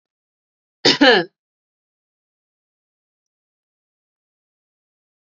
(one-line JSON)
{"cough_length": "5.3 s", "cough_amplitude": 30939, "cough_signal_mean_std_ratio": 0.2, "survey_phase": "beta (2021-08-13 to 2022-03-07)", "age": "18-44", "gender": "Female", "wearing_mask": "No", "symptom_abdominal_pain": true, "smoker_status": "Never smoked", "respiratory_condition_asthma": false, "respiratory_condition_other": false, "recruitment_source": "REACT", "submission_delay": "5 days", "covid_test_result": "Negative", "covid_test_method": "RT-qPCR", "influenza_a_test_result": "Negative", "influenza_b_test_result": "Negative"}